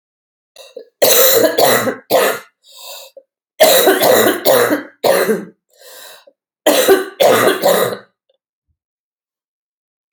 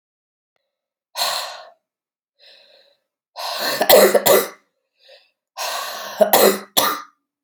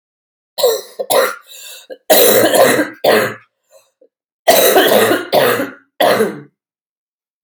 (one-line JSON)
{"three_cough_length": "10.1 s", "three_cough_amplitude": 32768, "three_cough_signal_mean_std_ratio": 0.54, "exhalation_length": "7.4 s", "exhalation_amplitude": 32768, "exhalation_signal_mean_std_ratio": 0.39, "cough_length": "7.4 s", "cough_amplitude": 32768, "cough_signal_mean_std_ratio": 0.56, "survey_phase": "alpha (2021-03-01 to 2021-08-12)", "age": "18-44", "gender": "Female", "wearing_mask": "No", "symptom_cough_any": true, "symptom_new_continuous_cough": true, "symptom_shortness_of_breath": true, "symptom_change_to_sense_of_smell_or_taste": true, "symptom_loss_of_taste": true, "symptom_onset": "12 days", "smoker_status": "Ex-smoker", "respiratory_condition_asthma": true, "respiratory_condition_other": false, "recruitment_source": "REACT", "submission_delay": "4 days", "covid_test_result": "Negative", "covid_test_method": "RT-qPCR"}